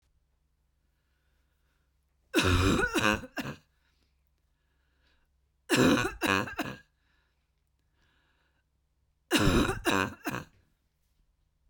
{"three_cough_length": "11.7 s", "three_cough_amplitude": 10967, "three_cough_signal_mean_std_ratio": 0.37, "survey_phase": "beta (2021-08-13 to 2022-03-07)", "age": "18-44", "gender": "Female", "wearing_mask": "No", "symptom_shortness_of_breath": true, "symptom_fatigue": true, "smoker_status": "Ex-smoker", "respiratory_condition_asthma": false, "respiratory_condition_other": false, "recruitment_source": "REACT", "submission_delay": "3 days", "covid_test_result": "Negative", "covid_test_method": "RT-qPCR", "influenza_a_test_result": "Negative", "influenza_b_test_result": "Negative"}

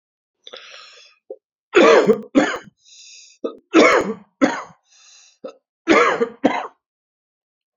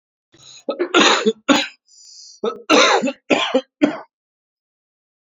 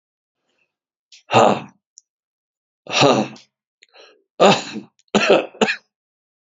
{"three_cough_length": "7.8 s", "three_cough_amplitude": 28411, "three_cough_signal_mean_std_ratio": 0.38, "cough_length": "5.3 s", "cough_amplitude": 32767, "cough_signal_mean_std_ratio": 0.44, "exhalation_length": "6.5 s", "exhalation_amplitude": 31787, "exhalation_signal_mean_std_ratio": 0.35, "survey_phase": "alpha (2021-03-01 to 2021-08-12)", "age": "45-64", "gender": "Male", "wearing_mask": "No", "symptom_cough_any": true, "symptom_fatigue": true, "symptom_change_to_sense_of_smell_or_taste": true, "symptom_onset": "6 days", "smoker_status": "Never smoked", "respiratory_condition_asthma": false, "respiratory_condition_other": false, "recruitment_source": "Test and Trace", "submission_delay": "2 days", "covid_test_result": "Positive", "covid_test_method": "RT-qPCR", "covid_ct_value": 14.9, "covid_ct_gene": "ORF1ab gene", "covid_ct_mean": 15.3, "covid_viral_load": "9700000 copies/ml", "covid_viral_load_category": "High viral load (>1M copies/ml)"}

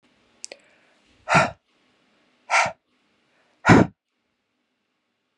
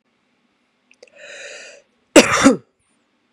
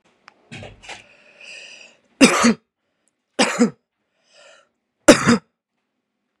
{"exhalation_length": "5.4 s", "exhalation_amplitude": 32707, "exhalation_signal_mean_std_ratio": 0.25, "cough_length": "3.3 s", "cough_amplitude": 32768, "cough_signal_mean_std_ratio": 0.26, "three_cough_length": "6.4 s", "three_cough_amplitude": 32768, "three_cough_signal_mean_std_ratio": 0.28, "survey_phase": "beta (2021-08-13 to 2022-03-07)", "age": "18-44", "gender": "Female", "wearing_mask": "No", "symptom_none": true, "smoker_status": "Never smoked", "respiratory_condition_asthma": false, "respiratory_condition_other": false, "recruitment_source": "REACT", "submission_delay": "3 days", "covid_test_result": "Negative", "covid_test_method": "RT-qPCR"}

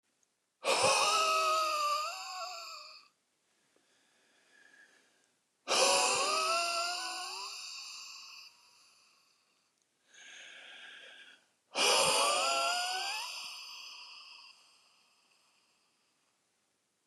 {"exhalation_length": "17.1 s", "exhalation_amplitude": 5725, "exhalation_signal_mean_std_ratio": 0.5, "survey_phase": "beta (2021-08-13 to 2022-03-07)", "age": "45-64", "gender": "Male", "wearing_mask": "No", "symptom_none": true, "smoker_status": "Never smoked", "respiratory_condition_asthma": false, "respiratory_condition_other": false, "recruitment_source": "REACT", "submission_delay": "1 day", "covid_test_result": "Negative", "covid_test_method": "RT-qPCR", "influenza_a_test_result": "Negative", "influenza_b_test_result": "Negative"}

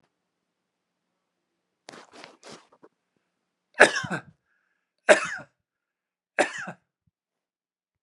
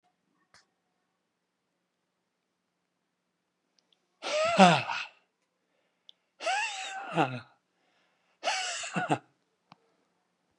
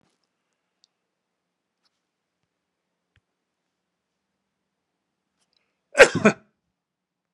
{"three_cough_length": "8.0 s", "three_cough_amplitude": 32767, "three_cough_signal_mean_std_ratio": 0.18, "exhalation_length": "10.6 s", "exhalation_amplitude": 20916, "exhalation_signal_mean_std_ratio": 0.29, "cough_length": "7.3 s", "cough_amplitude": 32767, "cough_signal_mean_std_ratio": 0.12, "survey_phase": "beta (2021-08-13 to 2022-03-07)", "age": "65+", "gender": "Male", "wearing_mask": "No", "symptom_fatigue": true, "symptom_change_to_sense_of_smell_or_taste": true, "smoker_status": "Never smoked", "respiratory_condition_asthma": false, "respiratory_condition_other": false, "recruitment_source": "REACT", "submission_delay": "13 days", "covid_test_result": "Negative", "covid_test_method": "RT-qPCR"}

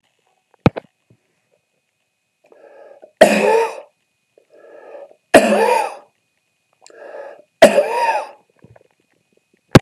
{"three_cough_length": "9.8 s", "three_cough_amplitude": 32768, "three_cough_signal_mean_std_ratio": 0.31, "survey_phase": "beta (2021-08-13 to 2022-03-07)", "age": "65+", "gender": "Male", "wearing_mask": "No", "symptom_cough_any": true, "symptom_runny_or_blocked_nose": true, "symptom_diarrhoea": true, "symptom_fatigue": true, "symptom_change_to_sense_of_smell_or_taste": true, "symptom_onset": "1 day", "smoker_status": "Ex-smoker", "respiratory_condition_asthma": false, "respiratory_condition_other": false, "recruitment_source": "Test and Trace", "submission_delay": "-1 day", "covid_test_result": "Positive", "covid_test_method": "RT-qPCR", "covid_ct_value": 11.2, "covid_ct_gene": "N gene", "covid_ct_mean": 11.8, "covid_viral_load": "130000000 copies/ml", "covid_viral_load_category": "High viral load (>1M copies/ml)"}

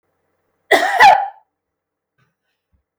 {"cough_length": "3.0 s", "cough_amplitude": 32768, "cough_signal_mean_std_ratio": 0.32, "survey_phase": "beta (2021-08-13 to 2022-03-07)", "age": "65+", "gender": "Female", "wearing_mask": "No", "symptom_none": true, "smoker_status": "Never smoked", "respiratory_condition_asthma": false, "respiratory_condition_other": false, "recruitment_source": "REACT", "submission_delay": "2 days", "covid_test_result": "Negative", "covid_test_method": "RT-qPCR", "influenza_a_test_result": "Negative", "influenza_b_test_result": "Negative"}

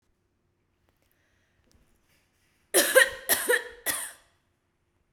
{"cough_length": "5.1 s", "cough_amplitude": 18581, "cough_signal_mean_std_ratio": 0.29, "survey_phase": "beta (2021-08-13 to 2022-03-07)", "age": "45-64", "gender": "Female", "wearing_mask": "No", "symptom_none": true, "smoker_status": "Never smoked", "respiratory_condition_asthma": false, "respiratory_condition_other": false, "recruitment_source": "REACT", "submission_delay": "1 day", "covid_test_result": "Negative", "covid_test_method": "RT-qPCR"}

